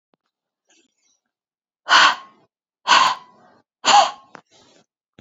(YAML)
exhalation_length: 5.2 s
exhalation_amplitude: 30251
exhalation_signal_mean_std_ratio: 0.31
survey_phase: beta (2021-08-13 to 2022-03-07)
age: 18-44
gender: Female
wearing_mask: 'No'
symptom_none: true
smoker_status: Never smoked
respiratory_condition_asthma: false
respiratory_condition_other: false
recruitment_source: REACT
submission_delay: 0 days
covid_test_result: Negative
covid_test_method: RT-qPCR